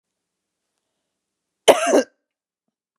{
  "cough_length": "3.0 s",
  "cough_amplitude": 32768,
  "cough_signal_mean_std_ratio": 0.23,
  "survey_phase": "beta (2021-08-13 to 2022-03-07)",
  "age": "45-64",
  "gender": "Female",
  "wearing_mask": "No",
  "symptom_none": true,
  "smoker_status": "Never smoked",
  "respiratory_condition_asthma": false,
  "respiratory_condition_other": false,
  "recruitment_source": "Test and Trace",
  "submission_delay": "2 days",
  "covid_test_result": "Positive",
  "covid_test_method": "RT-qPCR",
  "covid_ct_value": 35.9,
  "covid_ct_gene": "N gene"
}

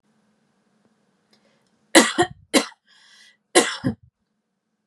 {
  "three_cough_length": "4.9 s",
  "three_cough_amplitude": 32767,
  "three_cough_signal_mean_std_ratio": 0.25,
  "survey_phase": "beta (2021-08-13 to 2022-03-07)",
  "age": "18-44",
  "gender": "Female",
  "wearing_mask": "No",
  "symptom_none": true,
  "smoker_status": "Never smoked",
  "respiratory_condition_asthma": false,
  "respiratory_condition_other": false,
  "recruitment_source": "REACT",
  "submission_delay": "0 days",
  "covid_test_result": "Negative",
  "covid_test_method": "RT-qPCR",
  "influenza_a_test_result": "Negative",
  "influenza_b_test_result": "Negative"
}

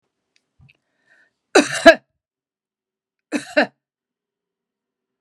{
  "cough_length": "5.2 s",
  "cough_amplitude": 32768,
  "cough_signal_mean_std_ratio": 0.19,
  "survey_phase": "beta (2021-08-13 to 2022-03-07)",
  "age": "45-64",
  "gender": "Female",
  "wearing_mask": "No",
  "symptom_none": true,
  "smoker_status": "Never smoked",
  "respiratory_condition_asthma": false,
  "respiratory_condition_other": false,
  "recruitment_source": "REACT",
  "submission_delay": "1 day",
  "covid_test_result": "Negative",
  "covid_test_method": "RT-qPCR"
}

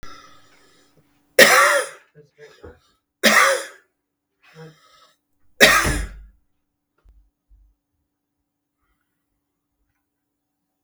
{
  "three_cough_length": "10.8 s",
  "three_cough_amplitude": 32768,
  "three_cough_signal_mean_std_ratio": 0.27,
  "survey_phase": "beta (2021-08-13 to 2022-03-07)",
  "age": "45-64",
  "gender": "Male",
  "wearing_mask": "No",
  "symptom_cough_any": true,
  "symptom_runny_or_blocked_nose": true,
  "symptom_change_to_sense_of_smell_or_taste": true,
  "symptom_onset": "3 days",
  "smoker_status": "Never smoked",
  "respiratory_condition_asthma": false,
  "respiratory_condition_other": false,
  "recruitment_source": "Test and Trace",
  "submission_delay": "2 days",
  "covid_test_result": "Positive",
  "covid_test_method": "ePCR"
}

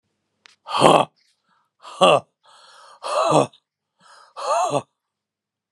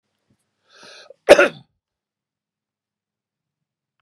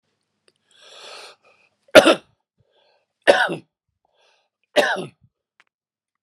{
  "exhalation_length": "5.7 s",
  "exhalation_amplitude": 32768,
  "exhalation_signal_mean_std_ratio": 0.35,
  "cough_length": "4.0 s",
  "cough_amplitude": 32768,
  "cough_signal_mean_std_ratio": 0.16,
  "three_cough_length": "6.2 s",
  "three_cough_amplitude": 32768,
  "three_cough_signal_mean_std_ratio": 0.23,
  "survey_phase": "beta (2021-08-13 to 2022-03-07)",
  "age": "65+",
  "gender": "Male",
  "wearing_mask": "No",
  "symptom_cough_any": true,
  "smoker_status": "Never smoked",
  "respiratory_condition_asthma": false,
  "respiratory_condition_other": false,
  "recruitment_source": "REACT",
  "submission_delay": "0 days",
  "covid_test_result": "Negative",
  "covid_test_method": "RT-qPCR"
}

